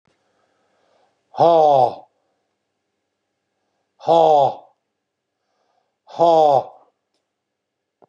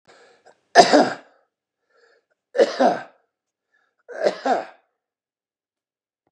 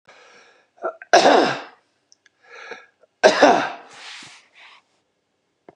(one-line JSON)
{"exhalation_length": "8.1 s", "exhalation_amplitude": 26309, "exhalation_signal_mean_std_ratio": 0.34, "three_cough_length": "6.3 s", "three_cough_amplitude": 32768, "three_cough_signal_mean_std_ratio": 0.29, "cough_length": "5.8 s", "cough_amplitude": 32288, "cough_signal_mean_std_ratio": 0.32, "survey_phase": "beta (2021-08-13 to 2022-03-07)", "age": "65+", "gender": "Male", "wearing_mask": "No", "symptom_none": true, "smoker_status": "Ex-smoker", "respiratory_condition_asthma": false, "respiratory_condition_other": false, "recruitment_source": "REACT", "submission_delay": "2 days", "covid_test_result": "Negative", "covid_test_method": "RT-qPCR", "influenza_a_test_result": "Negative", "influenza_b_test_result": "Negative"}